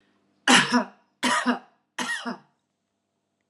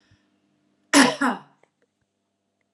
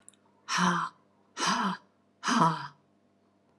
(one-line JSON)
{"three_cough_length": "3.5 s", "three_cough_amplitude": 26041, "three_cough_signal_mean_std_ratio": 0.39, "cough_length": "2.7 s", "cough_amplitude": 29450, "cough_signal_mean_std_ratio": 0.27, "exhalation_length": "3.6 s", "exhalation_amplitude": 10714, "exhalation_signal_mean_std_ratio": 0.48, "survey_phase": "alpha (2021-03-01 to 2021-08-12)", "age": "45-64", "gender": "Female", "wearing_mask": "No", "symptom_none": true, "symptom_onset": "12 days", "smoker_status": "Never smoked", "respiratory_condition_asthma": true, "respiratory_condition_other": false, "recruitment_source": "REACT", "submission_delay": "8 days", "covid_test_result": "Negative", "covid_test_method": "RT-qPCR"}